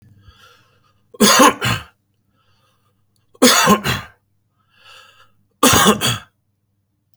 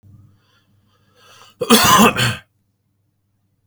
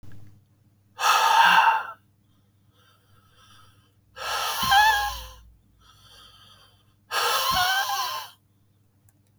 {
  "three_cough_length": "7.2 s",
  "three_cough_amplitude": 32768,
  "three_cough_signal_mean_std_ratio": 0.37,
  "cough_length": "3.7 s",
  "cough_amplitude": 32768,
  "cough_signal_mean_std_ratio": 0.34,
  "exhalation_length": "9.4 s",
  "exhalation_amplitude": 20057,
  "exhalation_signal_mean_std_ratio": 0.47,
  "survey_phase": "beta (2021-08-13 to 2022-03-07)",
  "age": "18-44",
  "gender": "Male",
  "wearing_mask": "No",
  "symptom_none": true,
  "smoker_status": "Ex-smoker",
  "respiratory_condition_asthma": false,
  "respiratory_condition_other": false,
  "recruitment_source": "REACT",
  "submission_delay": "0 days",
  "covid_test_result": "Negative",
  "covid_test_method": "RT-qPCR",
  "influenza_a_test_result": "Negative",
  "influenza_b_test_result": "Negative"
}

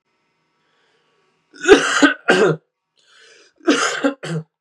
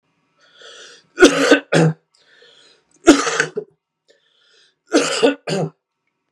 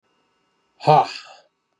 {
  "cough_length": "4.6 s",
  "cough_amplitude": 32768,
  "cough_signal_mean_std_ratio": 0.4,
  "three_cough_length": "6.3 s",
  "three_cough_amplitude": 32768,
  "three_cough_signal_mean_std_ratio": 0.37,
  "exhalation_length": "1.8 s",
  "exhalation_amplitude": 26807,
  "exhalation_signal_mean_std_ratio": 0.28,
  "survey_phase": "beta (2021-08-13 to 2022-03-07)",
  "age": "18-44",
  "gender": "Male",
  "wearing_mask": "No",
  "symptom_cough_any": true,
  "symptom_runny_or_blocked_nose": true,
  "symptom_onset": "8 days",
  "smoker_status": "Never smoked",
  "respiratory_condition_asthma": true,
  "respiratory_condition_other": false,
  "recruitment_source": "REACT",
  "submission_delay": "1 day",
  "covid_test_result": "Negative",
  "covid_test_method": "RT-qPCR"
}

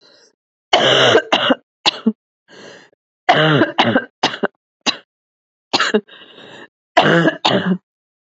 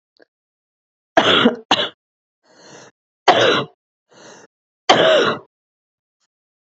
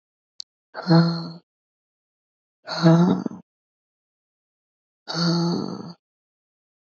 {
  "cough_length": "8.4 s",
  "cough_amplitude": 29935,
  "cough_signal_mean_std_ratio": 0.47,
  "three_cough_length": "6.7 s",
  "three_cough_amplitude": 32202,
  "three_cough_signal_mean_std_ratio": 0.36,
  "exhalation_length": "6.8 s",
  "exhalation_amplitude": 20019,
  "exhalation_signal_mean_std_ratio": 0.38,
  "survey_phase": "beta (2021-08-13 to 2022-03-07)",
  "age": "18-44",
  "gender": "Female",
  "wearing_mask": "No",
  "symptom_cough_any": true,
  "symptom_new_continuous_cough": true,
  "symptom_headache": true,
  "symptom_other": true,
  "smoker_status": "Never smoked",
  "respiratory_condition_asthma": false,
  "respiratory_condition_other": false,
  "recruitment_source": "Test and Trace",
  "submission_delay": "0 days",
  "covid_test_result": "Negative",
  "covid_test_method": "LFT"
}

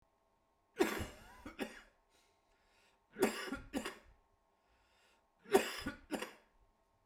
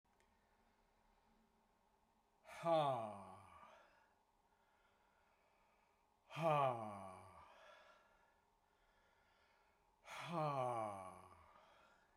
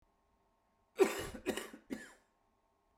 {
  "three_cough_length": "7.1 s",
  "three_cough_amplitude": 6052,
  "three_cough_signal_mean_std_ratio": 0.32,
  "exhalation_length": "12.2 s",
  "exhalation_amplitude": 1731,
  "exhalation_signal_mean_std_ratio": 0.36,
  "cough_length": "3.0 s",
  "cough_amplitude": 5625,
  "cough_signal_mean_std_ratio": 0.29,
  "survey_phase": "beta (2021-08-13 to 2022-03-07)",
  "age": "45-64",
  "gender": "Male",
  "wearing_mask": "No",
  "symptom_cough_any": true,
  "symptom_runny_or_blocked_nose": true,
  "symptom_sore_throat": true,
  "symptom_fatigue": true,
  "symptom_change_to_sense_of_smell_or_taste": true,
  "smoker_status": "Never smoked",
  "respiratory_condition_asthma": false,
  "respiratory_condition_other": false,
  "recruitment_source": "Test and Trace",
  "submission_delay": "1 day",
  "covid_test_result": "Positive",
  "covid_test_method": "LFT"
}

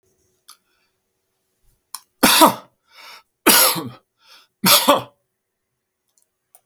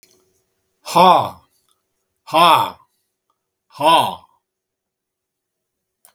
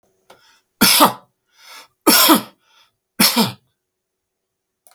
{
  "three_cough_length": "6.7 s",
  "three_cough_amplitude": 32768,
  "three_cough_signal_mean_std_ratio": 0.31,
  "exhalation_length": "6.1 s",
  "exhalation_amplitude": 32768,
  "exhalation_signal_mean_std_ratio": 0.32,
  "cough_length": "4.9 s",
  "cough_amplitude": 32768,
  "cough_signal_mean_std_ratio": 0.35,
  "survey_phase": "beta (2021-08-13 to 2022-03-07)",
  "age": "65+",
  "gender": "Male",
  "wearing_mask": "No",
  "symptom_none": true,
  "smoker_status": "Never smoked",
  "respiratory_condition_asthma": false,
  "respiratory_condition_other": false,
  "recruitment_source": "REACT",
  "submission_delay": "2 days",
  "covid_test_result": "Negative",
  "covid_test_method": "RT-qPCR",
  "influenza_a_test_result": "Negative",
  "influenza_b_test_result": "Negative"
}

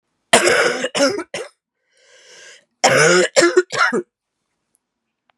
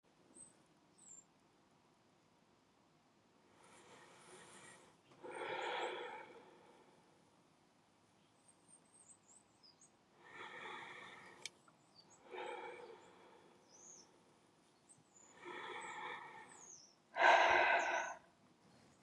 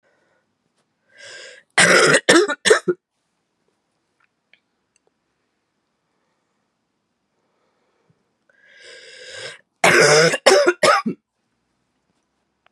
{
  "cough_length": "5.4 s",
  "cough_amplitude": 32768,
  "cough_signal_mean_std_ratio": 0.47,
  "exhalation_length": "19.0 s",
  "exhalation_amplitude": 4701,
  "exhalation_signal_mean_std_ratio": 0.31,
  "three_cough_length": "12.7 s",
  "three_cough_amplitude": 32768,
  "three_cough_signal_mean_std_ratio": 0.32,
  "survey_phase": "beta (2021-08-13 to 2022-03-07)",
  "age": "18-44",
  "gender": "Female",
  "wearing_mask": "No",
  "symptom_cough_any": true,
  "symptom_runny_or_blocked_nose": true,
  "symptom_fatigue": true,
  "symptom_headache": true,
  "symptom_change_to_sense_of_smell_or_taste": true,
  "symptom_loss_of_taste": true,
  "symptom_onset": "3 days",
  "smoker_status": "Never smoked",
  "respiratory_condition_asthma": false,
  "respiratory_condition_other": false,
  "recruitment_source": "Test and Trace",
  "submission_delay": "2 days",
  "covid_test_result": "Positive",
  "covid_test_method": "RT-qPCR",
  "covid_ct_value": 19.4,
  "covid_ct_gene": "ORF1ab gene",
  "covid_ct_mean": 19.7,
  "covid_viral_load": "350000 copies/ml",
  "covid_viral_load_category": "Low viral load (10K-1M copies/ml)"
}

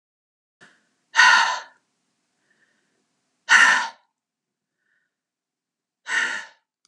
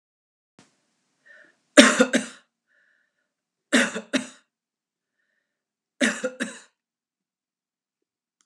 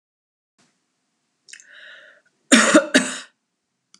{
  "exhalation_length": "6.9 s",
  "exhalation_amplitude": 29883,
  "exhalation_signal_mean_std_ratio": 0.3,
  "three_cough_length": "8.5 s",
  "three_cough_amplitude": 32768,
  "three_cough_signal_mean_std_ratio": 0.22,
  "cough_length": "4.0 s",
  "cough_amplitude": 32681,
  "cough_signal_mean_std_ratio": 0.27,
  "survey_phase": "beta (2021-08-13 to 2022-03-07)",
  "age": "65+",
  "gender": "Female",
  "wearing_mask": "No",
  "symptom_cough_any": true,
  "smoker_status": "Never smoked",
  "respiratory_condition_asthma": false,
  "respiratory_condition_other": false,
  "recruitment_source": "REACT",
  "submission_delay": "2 days",
  "covid_test_result": "Negative",
  "covid_test_method": "RT-qPCR"
}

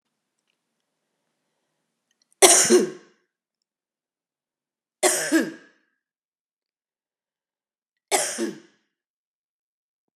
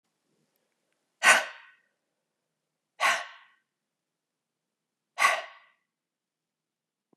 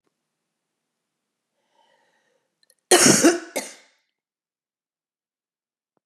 {
  "three_cough_length": "10.2 s",
  "three_cough_amplitude": 32767,
  "three_cough_signal_mean_std_ratio": 0.25,
  "exhalation_length": "7.2 s",
  "exhalation_amplitude": 20426,
  "exhalation_signal_mean_std_ratio": 0.22,
  "cough_length": "6.1 s",
  "cough_amplitude": 28520,
  "cough_signal_mean_std_ratio": 0.22,
  "survey_phase": "beta (2021-08-13 to 2022-03-07)",
  "age": "45-64",
  "gender": "Female",
  "wearing_mask": "No",
  "symptom_cough_any": true,
  "symptom_runny_or_blocked_nose": true,
  "symptom_fatigue": true,
  "symptom_headache": true,
  "symptom_change_to_sense_of_smell_or_taste": true,
  "symptom_onset": "4 days",
  "smoker_status": "Ex-smoker",
  "respiratory_condition_asthma": false,
  "respiratory_condition_other": false,
  "recruitment_source": "Test and Trace",
  "submission_delay": "1 day",
  "covid_test_result": "Positive",
  "covid_test_method": "RT-qPCR",
  "covid_ct_value": 13.1,
  "covid_ct_gene": "ORF1ab gene",
  "covid_ct_mean": 13.6,
  "covid_viral_load": "35000000 copies/ml",
  "covid_viral_load_category": "High viral load (>1M copies/ml)"
}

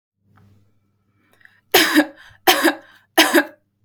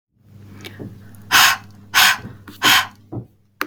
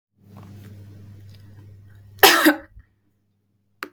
{
  "three_cough_length": "3.8 s",
  "three_cough_amplitude": 32768,
  "three_cough_signal_mean_std_ratio": 0.36,
  "exhalation_length": "3.7 s",
  "exhalation_amplitude": 32768,
  "exhalation_signal_mean_std_ratio": 0.42,
  "cough_length": "3.9 s",
  "cough_amplitude": 32768,
  "cough_signal_mean_std_ratio": 0.27,
  "survey_phase": "beta (2021-08-13 to 2022-03-07)",
  "age": "18-44",
  "gender": "Female",
  "wearing_mask": "No",
  "symptom_none": true,
  "smoker_status": "Never smoked",
  "respiratory_condition_asthma": false,
  "respiratory_condition_other": false,
  "recruitment_source": "REACT",
  "submission_delay": "2 days",
  "covid_test_result": "Negative",
  "covid_test_method": "RT-qPCR",
  "influenza_a_test_result": "Negative",
  "influenza_b_test_result": "Negative"
}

